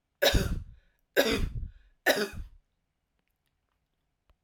{"three_cough_length": "4.4 s", "three_cough_amplitude": 11074, "three_cough_signal_mean_std_ratio": 0.38, "survey_phase": "alpha (2021-03-01 to 2021-08-12)", "age": "18-44", "gender": "Female", "wearing_mask": "No", "symptom_none": true, "smoker_status": "Ex-smoker", "respiratory_condition_asthma": false, "respiratory_condition_other": false, "recruitment_source": "REACT", "submission_delay": "5 days", "covid_test_result": "Negative", "covid_test_method": "RT-qPCR"}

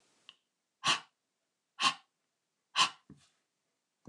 {"exhalation_length": "4.1 s", "exhalation_amplitude": 7211, "exhalation_signal_mean_std_ratio": 0.24, "survey_phase": "beta (2021-08-13 to 2022-03-07)", "age": "45-64", "gender": "Female", "wearing_mask": "No", "symptom_none": true, "smoker_status": "Never smoked", "respiratory_condition_asthma": false, "respiratory_condition_other": false, "recruitment_source": "REACT", "submission_delay": "1 day", "covid_test_result": "Negative", "covid_test_method": "RT-qPCR"}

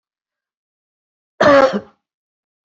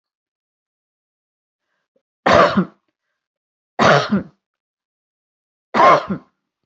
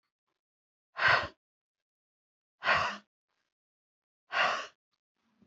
{"cough_length": "2.6 s", "cough_amplitude": 27780, "cough_signal_mean_std_ratio": 0.3, "three_cough_length": "6.7 s", "three_cough_amplitude": 32671, "three_cough_signal_mean_std_ratio": 0.32, "exhalation_length": "5.5 s", "exhalation_amplitude": 7833, "exhalation_signal_mean_std_ratio": 0.31, "survey_phase": "beta (2021-08-13 to 2022-03-07)", "age": "45-64", "gender": "Female", "wearing_mask": "No", "symptom_cough_any": true, "symptom_shortness_of_breath": true, "symptom_fatigue": true, "symptom_change_to_sense_of_smell_or_taste": true, "symptom_onset": "12 days", "smoker_status": "Ex-smoker", "respiratory_condition_asthma": false, "respiratory_condition_other": false, "recruitment_source": "REACT", "submission_delay": "1 day", "covid_test_result": "Negative", "covid_test_method": "RT-qPCR"}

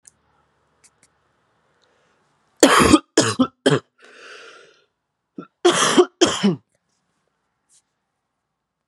{"cough_length": "8.9 s", "cough_amplitude": 32768, "cough_signal_mean_std_ratio": 0.31, "survey_phase": "beta (2021-08-13 to 2022-03-07)", "age": "18-44", "gender": "Male", "wearing_mask": "No", "symptom_cough_any": true, "symptom_runny_or_blocked_nose": true, "symptom_fatigue": true, "symptom_fever_high_temperature": true, "symptom_change_to_sense_of_smell_or_taste": true, "symptom_loss_of_taste": true, "symptom_onset": "6 days", "smoker_status": "Never smoked", "respiratory_condition_asthma": false, "respiratory_condition_other": false, "recruitment_source": "Test and Trace", "submission_delay": "3 days", "covid_test_result": "Positive", "covid_test_method": "RT-qPCR", "covid_ct_value": 19.4, "covid_ct_gene": "ORF1ab gene", "covid_ct_mean": 20.6, "covid_viral_load": "170000 copies/ml", "covid_viral_load_category": "Low viral load (10K-1M copies/ml)"}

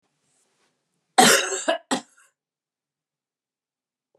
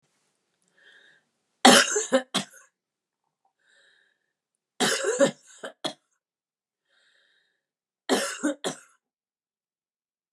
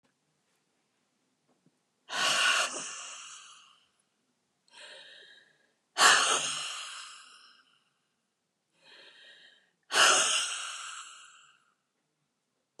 {"cough_length": "4.2 s", "cough_amplitude": 29771, "cough_signal_mean_std_ratio": 0.26, "three_cough_length": "10.3 s", "three_cough_amplitude": 30622, "three_cough_signal_mean_std_ratio": 0.26, "exhalation_length": "12.8 s", "exhalation_amplitude": 15561, "exhalation_signal_mean_std_ratio": 0.34, "survey_phase": "beta (2021-08-13 to 2022-03-07)", "age": "65+", "gender": "Female", "wearing_mask": "No", "symptom_none": true, "symptom_onset": "7 days", "smoker_status": "Ex-smoker", "respiratory_condition_asthma": false, "respiratory_condition_other": false, "recruitment_source": "REACT", "submission_delay": "15 days", "covid_test_result": "Negative", "covid_test_method": "RT-qPCR"}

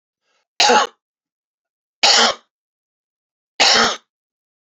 {"three_cough_length": "4.8 s", "three_cough_amplitude": 31448, "three_cough_signal_mean_std_ratio": 0.36, "survey_phase": "alpha (2021-03-01 to 2021-08-12)", "age": "65+", "gender": "Male", "wearing_mask": "No", "symptom_none": true, "smoker_status": "Ex-smoker", "respiratory_condition_asthma": false, "respiratory_condition_other": false, "recruitment_source": "REACT", "submission_delay": "1 day", "covid_test_result": "Negative", "covid_test_method": "RT-qPCR"}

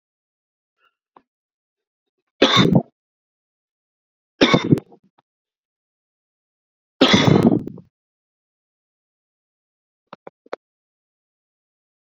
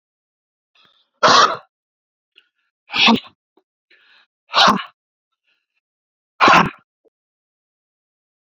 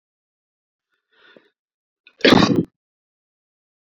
{"three_cough_length": "12.0 s", "three_cough_amplitude": 32768, "three_cough_signal_mean_std_ratio": 0.25, "exhalation_length": "8.5 s", "exhalation_amplitude": 30764, "exhalation_signal_mean_std_ratio": 0.28, "cough_length": "3.9 s", "cough_amplitude": 28000, "cough_signal_mean_std_ratio": 0.23, "survey_phase": "beta (2021-08-13 to 2022-03-07)", "age": "18-44", "gender": "Male", "wearing_mask": "No", "symptom_sore_throat": true, "smoker_status": "Never smoked", "respiratory_condition_asthma": true, "respiratory_condition_other": false, "recruitment_source": "REACT", "submission_delay": "0 days", "covid_test_result": "Negative", "covid_test_method": "RT-qPCR"}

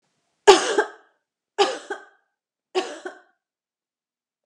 {"three_cough_length": "4.5 s", "three_cough_amplitude": 32767, "three_cough_signal_mean_std_ratio": 0.26, "survey_phase": "alpha (2021-03-01 to 2021-08-12)", "age": "65+", "gender": "Female", "wearing_mask": "No", "symptom_none": true, "smoker_status": "Ex-smoker", "respiratory_condition_asthma": false, "respiratory_condition_other": false, "recruitment_source": "REACT", "submission_delay": "1 day", "covid_test_result": "Negative", "covid_test_method": "RT-qPCR"}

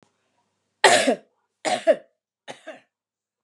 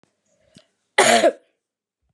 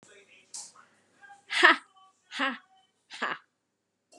{"three_cough_length": "3.4 s", "three_cough_amplitude": 31690, "three_cough_signal_mean_std_ratio": 0.3, "cough_length": "2.1 s", "cough_amplitude": 29088, "cough_signal_mean_std_ratio": 0.32, "exhalation_length": "4.2 s", "exhalation_amplitude": 28702, "exhalation_signal_mean_std_ratio": 0.26, "survey_phase": "beta (2021-08-13 to 2022-03-07)", "age": "45-64", "gender": "Female", "wearing_mask": "No", "symptom_cough_any": true, "symptom_runny_or_blocked_nose": true, "symptom_onset": "6 days", "smoker_status": "Never smoked", "respiratory_condition_asthma": false, "respiratory_condition_other": false, "recruitment_source": "REACT", "submission_delay": "1 day", "covid_test_result": "Negative", "covid_test_method": "RT-qPCR", "influenza_a_test_result": "Negative", "influenza_b_test_result": "Negative"}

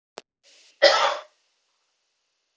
{"cough_length": "2.6 s", "cough_amplitude": 30267, "cough_signal_mean_std_ratio": 0.27, "survey_phase": "beta (2021-08-13 to 2022-03-07)", "age": "18-44", "gender": "Female", "wearing_mask": "No", "symptom_none": true, "smoker_status": "Never smoked", "respiratory_condition_asthma": false, "respiratory_condition_other": false, "recruitment_source": "REACT", "submission_delay": "1 day", "covid_test_result": "Negative", "covid_test_method": "RT-qPCR"}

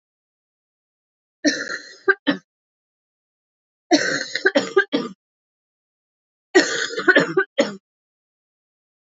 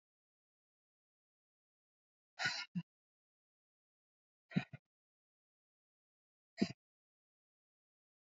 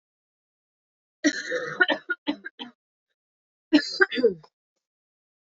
{"three_cough_length": "9.0 s", "three_cough_amplitude": 30289, "three_cough_signal_mean_std_ratio": 0.34, "exhalation_length": "8.4 s", "exhalation_amplitude": 3247, "exhalation_signal_mean_std_ratio": 0.17, "cough_length": "5.5 s", "cough_amplitude": 22615, "cough_signal_mean_std_ratio": 0.32, "survey_phase": "alpha (2021-03-01 to 2021-08-12)", "age": "18-44", "gender": "Female", "wearing_mask": "No", "symptom_cough_any": true, "symptom_fatigue": true, "symptom_fever_high_temperature": true, "symptom_headache": true, "symptom_onset": "3 days", "smoker_status": "Never smoked", "respiratory_condition_asthma": false, "respiratory_condition_other": false, "recruitment_source": "Test and Trace", "submission_delay": "2 days", "covid_test_result": "Positive", "covid_test_method": "RT-qPCR", "covid_ct_value": 13.8, "covid_ct_gene": "ORF1ab gene", "covid_ct_mean": 14.8, "covid_viral_load": "14000000 copies/ml", "covid_viral_load_category": "High viral load (>1M copies/ml)"}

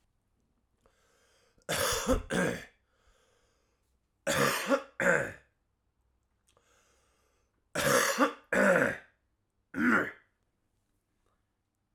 {"three_cough_length": "11.9 s", "three_cough_amplitude": 8079, "three_cough_signal_mean_std_ratio": 0.4, "survey_phase": "alpha (2021-03-01 to 2021-08-12)", "age": "18-44", "gender": "Male", "wearing_mask": "No", "symptom_cough_any": true, "symptom_shortness_of_breath": true, "symptom_change_to_sense_of_smell_or_taste": true, "symptom_loss_of_taste": true, "symptom_onset": "4 days", "smoker_status": "Never smoked", "respiratory_condition_asthma": false, "respiratory_condition_other": false, "recruitment_source": "Test and Trace", "submission_delay": "1 day", "covid_test_result": "Positive", "covid_test_method": "RT-qPCR", "covid_ct_value": 15.5, "covid_ct_gene": "ORF1ab gene"}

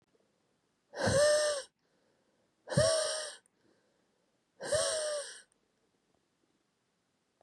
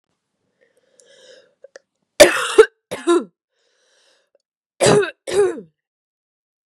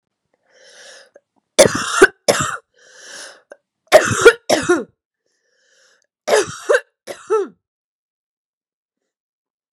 {"exhalation_length": "7.4 s", "exhalation_amplitude": 5841, "exhalation_signal_mean_std_ratio": 0.41, "cough_length": "6.7 s", "cough_amplitude": 32768, "cough_signal_mean_std_ratio": 0.29, "three_cough_length": "9.7 s", "three_cough_amplitude": 32768, "three_cough_signal_mean_std_ratio": 0.3, "survey_phase": "beta (2021-08-13 to 2022-03-07)", "age": "18-44", "gender": "Female", "wearing_mask": "No", "symptom_cough_any": true, "symptom_new_continuous_cough": true, "symptom_runny_or_blocked_nose": true, "symptom_sore_throat": true, "symptom_fatigue": true, "symptom_other": true, "smoker_status": "Never smoked", "respiratory_condition_asthma": false, "respiratory_condition_other": false, "recruitment_source": "Test and Trace", "submission_delay": "1 day", "covid_test_result": "Positive", "covid_test_method": "LFT"}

